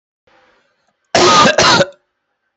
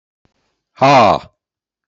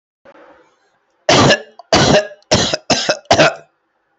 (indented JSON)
{
  "cough_length": "2.6 s",
  "cough_amplitude": 30707,
  "cough_signal_mean_std_ratio": 0.48,
  "exhalation_length": "1.9 s",
  "exhalation_amplitude": 32155,
  "exhalation_signal_mean_std_ratio": 0.39,
  "three_cough_length": "4.2 s",
  "three_cough_amplitude": 32767,
  "three_cough_signal_mean_std_ratio": 0.49,
  "survey_phase": "beta (2021-08-13 to 2022-03-07)",
  "age": "18-44",
  "gender": "Male",
  "wearing_mask": "No",
  "symptom_cough_any": true,
  "symptom_runny_or_blocked_nose": true,
  "symptom_diarrhoea": true,
  "symptom_fatigue": true,
  "symptom_fever_high_temperature": true,
  "symptom_headache": true,
  "symptom_change_to_sense_of_smell_or_taste": true,
  "symptom_loss_of_taste": true,
  "symptom_onset": "5 days",
  "smoker_status": "Never smoked",
  "respiratory_condition_asthma": false,
  "respiratory_condition_other": false,
  "recruitment_source": "Test and Trace",
  "submission_delay": "1 day",
  "covid_test_result": "Positive",
  "covid_test_method": "RT-qPCR",
  "covid_ct_value": 16.2,
  "covid_ct_gene": "ORF1ab gene",
  "covid_ct_mean": 16.5,
  "covid_viral_load": "3900000 copies/ml",
  "covid_viral_load_category": "High viral load (>1M copies/ml)"
}